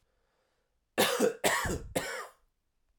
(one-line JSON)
{"three_cough_length": "3.0 s", "three_cough_amplitude": 12129, "three_cough_signal_mean_std_ratio": 0.46, "survey_phase": "alpha (2021-03-01 to 2021-08-12)", "age": "18-44", "gender": "Male", "wearing_mask": "No", "symptom_cough_any": true, "symptom_new_continuous_cough": true, "symptom_shortness_of_breath": true, "symptom_abdominal_pain": true, "symptom_diarrhoea": true, "symptom_fatigue": true, "symptom_onset": "3 days", "smoker_status": "Ex-smoker", "respiratory_condition_asthma": false, "respiratory_condition_other": false, "recruitment_source": "Test and Trace", "submission_delay": "2 days", "covid_test_result": "Positive", "covid_test_method": "RT-qPCR", "covid_ct_value": 21.9, "covid_ct_gene": "ORF1ab gene", "covid_ct_mean": 22.5, "covid_viral_load": "43000 copies/ml", "covid_viral_load_category": "Low viral load (10K-1M copies/ml)"}